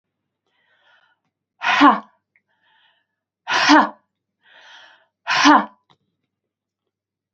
{"exhalation_length": "7.3 s", "exhalation_amplitude": 27705, "exhalation_signal_mean_std_ratio": 0.29, "survey_phase": "beta (2021-08-13 to 2022-03-07)", "age": "45-64", "gender": "Female", "wearing_mask": "No", "symptom_cough_any": true, "symptom_fatigue": true, "symptom_fever_high_temperature": true, "symptom_headache": true, "symptom_change_to_sense_of_smell_or_taste": true, "symptom_loss_of_taste": true, "smoker_status": "Prefer not to say", "respiratory_condition_asthma": false, "respiratory_condition_other": false, "recruitment_source": "Test and Trace", "submission_delay": "2 days", "covid_test_result": "Positive", "covid_test_method": "RT-qPCR", "covid_ct_value": 14.7, "covid_ct_gene": "ORF1ab gene", "covid_ct_mean": 14.9, "covid_viral_load": "13000000 copies/ml", "covid_viral_load_category": "High viral load (>1M copies/ml)"}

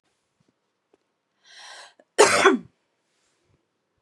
{"cough_length": "4.0 s", "cough_amplitude": 30008, "cough_signal_mean_std_ratio": 0.24, "survey_phase": "beta (2021-08-13 to 2022-03-07)", "age": "18-44", "gender": "Female", "wearing_mask": "No", "symptom_none": true, "smoker_status": "Ex-smoker", "respiratory_condition_asthma": false, "respiratory_condition_other": false, "recruitment_source": "REACT", "submission_delay": "14 days", "covid_test_result": "Negative", "covid_test_method": "RT-qPCR"}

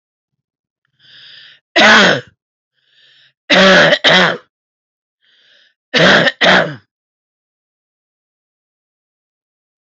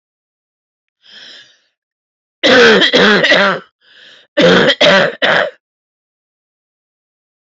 {"three_cough_length": "9.9 s", "three_cough_amplitude": 30751, "three_cough_signal_mean_std_ratio": 0.37, "cough_length": "7.6 s", "cough_amplitude": 32765, "cough_signal_mean_std_ratio": 0.46, "survey_phase": "alpha (2021-03-01 to 2021-08-12)", "age": "45-64", "gender": "Female", "wearing_mask": "No", "symptom_cough_any": true, "symptom_new_continuous_cough": true, "symptom_diarrhoea": true, "symptom_fatigue": true, "symptom_fever_high_temperature": true, "symptom_headache": true, "symptom_change_to_sense_of_smell_or_taste": true, "symptom_onset": "3 days", "smoker_status": "Current smoker (11 or more cigarettes per day)", "respiratory_condition_asthma": true, "respiratory_condition_other": false, "recruitment_source": "Test and Trace", "submission_delay": "2 days", "covid_test_result": "Positive", "covid_test_method": "RT-qPCR", "covid_ct_value": 25.2, "covid_ct_gene": "ORF1ab gene", "covid_ct_mean": 25.4, "covid_viral_load": "4700 copies/ml", "covid_viral_load_category": "Minimal viral load (< 10K copies/ml)"}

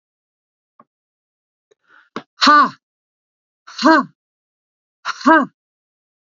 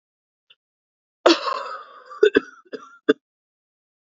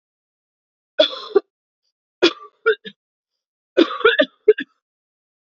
{"exhalation_length": "6.4 s", "exhalation_amplitude": 30938, "exhalation_signal_mean_std_ratio": 0.28, "cough_length": "4.1 s", "cough_amplitude": 28488, "cough_signal_mean_std_ratio": 0.26, "three_cough_length": "5.5 s", "three_cough_amplitude": 32434, "three_cough_signal_mean_std_ratio": 0.28, "survey_phase": "alpha (2021-03-01 to 2021-08-12)", "age": "45-64", "gender": "Female", "wearing_mask": "No", "symptom_cough_any": true, "symptom_fatigue": true, "symptom_headache": true, "symptom_change_to_sense_of_smell_or_taste": true, "symptom_onset": "4 days", "smoker_status": "Never smoked", "respiratory_condition_asthma": false, "respiratory_condition_other": false, "recruitment_source": "Test and Trace", "submission_delay": "2 days", "covid_test_result": "Positive", "covid_test_method": "RT-qPCR", "covid_ct_value": 12.2, "covid_ct_gene": "ORF1ab gene", "covid_ct_mean": 12.6, "covid_viral_load": "74000000 copies/ml", "covid_viral_load_category": "High viral load (>1M copies/ml)"}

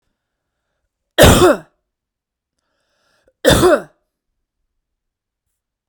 {"cough_length": "5.9 s", "cough_amplitude": 32768, "cough_signal_mean_std_ratio": 0.28, "survey_phase": "beta (2021-08-13 to 2022-03-07)", "age": "45-64", "gender": "Female", "wearing_mask": "No", "symptom_none": true, "smoker_status": "Never smoked", "respiratory_condition_asthma": false, "respiratory_condition_other": false, "recruitment_source": "REACT", "submission_delay": "1 day", "covid_test_result": "Negative", "covid_test_method": "RT-qPCR"}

